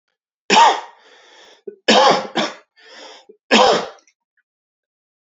{"three_cough_length": "5.3 s", "three_cough_amplitude": 30235, "three_cough_signal_mean_std_ratio": 0.38, "survey_phase": "beta (2021-08-13 to 2022-03-07)", "age": "18-44", "gender": "Male", "wearing_mask": "No", "symptom_cough_any": true, "symptom_runny_or_blocked_nose": true, "symptom_sore_throat": true, "symptom_fatigue": true, "symptom_headache": true, "symptom_change_to_sense_of_smell_or_taste": true, "symptom_loss_of_taste": true, "symptom_onset": "4 days", "smoker_status": "Never smoked", "respiratory_condition_asthma": false, "respiratory_condition_other": false, "recruitment_source": "Test and Trace", "submission_delay": "1 day", "covid_test_result": "Positive", "covid_test_method": "RT-qPCR", "covid_ct_value": 19.6, "covid_ct_gene": "ORF1ab gene"}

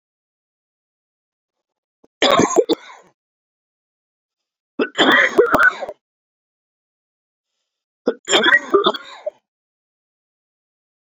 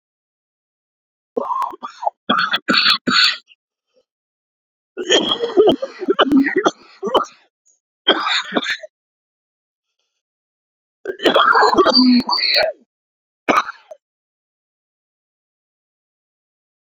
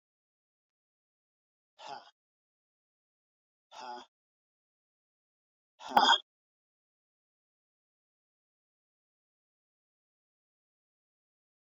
{"three_cough_length": "11.1 s", "three_cough_amplitude": 29912, "three_cough_signal_mean_std_ratio": 0.33, "cough_length": "16.9 s", "cough_amplitude": 32767, "cough_signal_mean_std_ratio": 0.43, "exhalation_length": "11.8 s", "exhalation_amplitude": 9938, "exhalation_signal_mean_std_ratio": 0.13, "survey_phase": "beta (2021-08-13 to 2022-03-07)", "age": "45-64", "gender": "Male", "wearing_mask": "No", "symptom_cough_any": true, "symptom_runny_or_blocked_nose": true, "symptom_shortness_of_breath": true, "symptom_fatigue": true, "symptom_headache": true, "symptom_change_to_sense_of_smell_or_taste": true, "smoker_status": "Ex-smoker", "respiratory_condition_asthma": true, "respiratory_condition_other": false, "recruitment_source": "Test and Trace", "submission_delay": "1 day", "covid_test_result": "Positive", "covid_test_method": "RT-qPCR", "covid_ct_value": 14.5, "covid_ct_gene": "ORF1ab gene", "covid_ct_mean": 15.0, "covid_viral_load": "12000000 copies/ml", "covid_viral_load_category": "High viral load (>1M copies/ml)"}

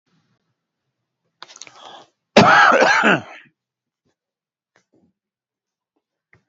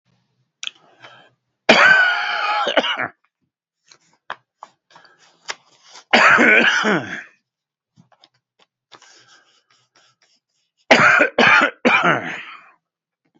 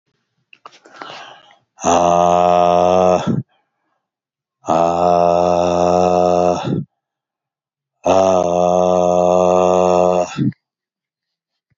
{"cough_length": "6.5 s", "cough_amplitude": 29755, "cough_signal_mean_std_ratio": 0.29, "three_cough_length": "13.4 s", "three_cough_amplitude": 31810, "three_cough_signal_mean_std_ratio": 0.4, "exhalation_length": "11.8 s", "exhalation_amplitude": 31874, "exhalation_signal_mean_std_ratio": 0.6, "survey_phase": "beta (2021-08-13 to 2022-03-07)", "age": "65+", "gender": "Male", "wearing_mask": "No", "symptom_none": true, "smoker_status": "Ex-smoker", "respiratory_condition_asthma": false, "respiratory_condition_other": false, "recruitment_source": "REACT", "submission_delay": "-1 day", "covid_test_result": "Negative", "covid_test_method": "RT-qPCR", "influenza_a_test_result": "Negative", "influenza_b_test_result": "Negative"}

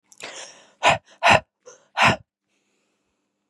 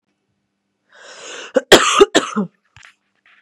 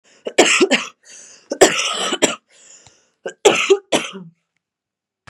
{"exhalation_length": "3.5 s", "exhalation_amplitude": 26998, "exhalation_signal_mean_std_ratio": 0.31, "cough_length": "3.4 s", "cough_amplitude": 32768, "cough_signal_mean_std_ratio": 0.31, "three_cough_length": "5.3 s", "three_cough_amplitude": 32768, "three_cough_signal_mean_std_ratio": 0.41, "survey_phase": "beta (2021-08-13 to 2022-03-07)", "age": "18-44", "gender": "Female", "wearing_mask": "No", "symptom_cough_any": true, "symptom_runny_or_blocked_nose": true, "symptom_shortness_of_breath": true, "symptom_fatigue": true, "symptom_headache": true, "symptom_change_to_sense_of_smell_or_taste": true, "symptom_onset": "3 days", "smoker_status": "Current smoker (11 or more cigarettes per day)", "respiratory_condition_asthma": false, "respiratory_condition_other": false, "recruitment_source": "REACT", "submission_delay": "1 day", "covid_test_result": "Negative", "covid_test_method": "RT-qPCR", "influenza_a_test_result": "Unknown/Void", "influenza_b_test_result": "Unknown/Void"}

